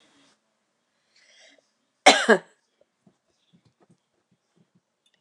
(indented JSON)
{
  "cough_length": "5.2 s",
  "cough_amplitude": 29199,
  "cough_signal_mean_std_ratio": 0.16,
  "survey_phase": "alpha (2021-03-01 to 2021-08-12)",
  "age": "65+",
  "gender": "Female",
  "wearing_mask": "No",
  "symptom_none": true,
  "smoker_status": "Never smoked",
  "respiratory_condition_asthma": false,
  "respiratory_condition_other": false,
  "recruitment_source": "REACT",
  "submission_delay": "2 days",
  "covid_test_result": "Negative",
  "covid_test_method": "RT-qPCR"
}